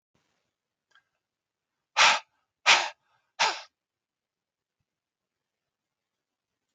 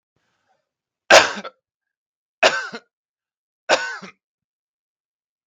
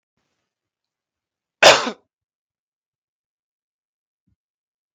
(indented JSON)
{
  "exhalation_length": "6.7 s",
  "exhalation_amplitude": 21582,
  "exhalation_signal_mean_std_ratio": 0.21,
  "three_cough_length": "5.5 s",
  "three_cough_amplitude": 32768,
  "three_cough_signal_mean_std_ratio": 0.23,
  "cough_length": "4.9 s",
  "cough_amplitude": 32768,
  "cough_signal_mean_std_ratio": 0.16,
  "survey_phase": "beta (2021-08-13 to 2022-03-07)",
  "age": "45-64",
  "gender": "Male",
  "wearing_mask": "No",
  "symptom_headache": true,
  "smoker_status": "Never smoked",
  "respiratory_condition_asthma": false,
  "respiratory_condition_other": false,
  "recruitment_source": "REACT",
  "submission_delay": "0 days",
  "covid_test_result": "Negative",
  "covid_test_method": "RT-qPCR"
}